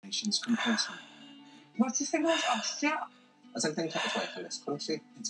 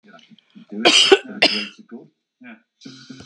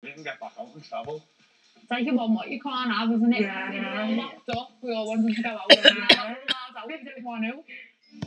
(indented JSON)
{
  "exhalation_length": "5.3 s",
  "exhalation_amplitude": 6422,
  "exhalation_signal_mean_std_ratio": 0.72,
  "cough_length": "3.3 s",
  "cough_amplitude": 32767,
  "cough_signal_mean_std_ratio": 0.35,
  "three_cough_length": "8.3 s",
  "three_cough_amplitude": 32130,
  "three_cough_signal_mean_std_ratio": 0.55,
  "survey_phase": "beta (2021-08-13 to 2022-03-07)",
  "age": "65+",
  "gender": "Female",
  "wearing_mask": "No",
  "symptom_none": true,
  "smoker_status": "Never smoked",
  "respiratory_condition_asthma": false,
  "respiratory_condition_other": false,
  "recruitment_source": "REACT",
  "submission_delay": "1 day",
  "covid_test_result": "Negative",
  "covid_test_method": "RT-qPCR",
  "influenza_a_test_result": "Negative",
  "influenza_b_test_result": "Negative"
}